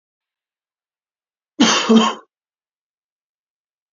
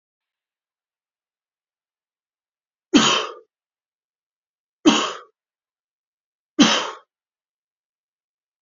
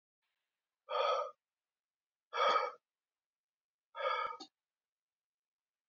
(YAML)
cough_length: 3.9 s
cough_amplitude: 27612
cough_signal_mean_std_ratio: 0.28
three_cough_length: 8.6 s
three_cough_amplitude: 30404
three_cough_signal_mean_std_ratio: 0.23
exhalation_length: 5.9 s
exhalation_amplitude: 3442
exhalation_signal_mean_std_ratio: 0.35
survey_phase: beta (2021-08-13 to 2022-03-07)
age: 45-64
gender: Male
wearing_mask: 'No'
symptom_cough_any: true
symptom_runny_or_blocked_nose: true
symptom_sore_throat: true
symptom_fever_high_temperature: true
symptom_headache: true
symptom_onset: 3 days
smoker_status: Never smoked
respiratory_condition_asthma: false
respiratory_condition_other: false
recruitment_source: Test and Trace
submission_delay: 1 day
covid_test_result: Positive
covid_test_method: RT-qPCR
covid_ct_value: 16.1
covid_ct_gene: ORF1ab gene
covid_ct_mean: 16.6
covid_viral_load: 3600000 copies/ml
covid_viral_load_category: High viral load (>1M copies/ml)